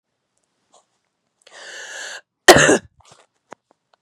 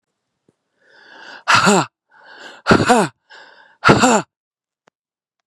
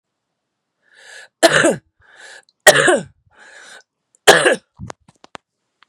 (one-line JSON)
{"cough_length": "4.0 s", "cough_amplitude": 32768, "cough_signal_mean_std_ratio": 0.23, "exhalation_length": "5.5 s", "exhalation_amplitude": 32768, "exhalation_signal_mean_std_ratio": 0.36, "three_cough_length": "5.9 s", "three_cough_amplitude": 32768, "three_cough_signal_mean_std_ratio": 0.31, "survey_phase": "beta (2021-08-13 to 2022-03-07)", "age": "18-44", "gender": "Female", "wearing_mask": "No", "symptom_cough_any": true, "symptom_runny_or_blocked_nose": true, "symptom_sore_throat": true, "symptom_fatigue": true, "symptom_fever_high_temperature": true, "symptom_headache": true, "symptom_onset": "3 days", "smoker_status": "Never smoked", "respiratory_condition_asthma": false, "respiratory_condition_other": false, "recruitment_source": "Test and Trace", "submission_delay": "2 days", "covid_test_result": "Positive", "covid_test_method": "ePCR"}